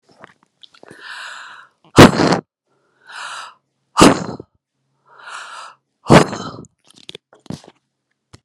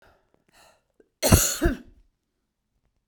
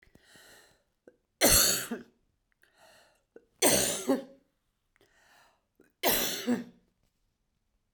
{"exhalation_length": "8.4 s", "exhalation_amplitude": 32768, "exhalation_signal_mean_std_ratio": 0.26, "cough_length": "3.1 s", "cough_amplitude": 32767, "cough_signal_mean_std_ratio": 0.28, "three_cough_length": "7.9 s", "three_cough_amplitude": 11859, "three_cough_signal_mean_std_ratio": 0.35, "survey_phase": "beta (2021-08-13 to 2022-03-07)", "age": "45-64", "gender": "Female", "wearing_mask": "No", "symptom_cough_any": true, "symptom_runny_or_blocked_nose": true, "symptom_onset": "8 days", "smoker_status": "Ex-smoker", "respiratory_condition_asthma": false, "respiratory_condition_other": false, "recruitment_source": "REACT", "submission_delay": "1 day", "covid_test_result": "Negative", "covid_test_method": "RT-qPCR", "influenza_a_test_result": "Negative", "influenza_b_test_result": "Negative"}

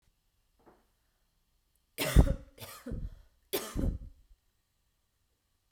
{"three_cough_length": "5.7 s", "three_cough_amplitude": 12611, "three_cough_signal_mean_std_ratio": 0.26, "survey_phase": "beta (2021-08-13 to 2022-03-07)", "age": "18-44", "gender": "Female", "wearing_mask": "No", "symptom_other": true, "smoker_status": "Never smoked", "respiratory_condition_asthma": false, "respiratory_condition_other": false, "recruitment_source": "Test and Trace", "submission_delay": "2 days", "covid_test_result": "Positive", "covid_test_method": "RT-qPCR", "covid_ct_value": 16.8, "covid_ct_gene": "N gene", "covid_ct_mean": 17.8, "covid_viral_load": "1400000 copies/ml", "covid_viral_load_category": "High viral load (>1M copies/ml)"}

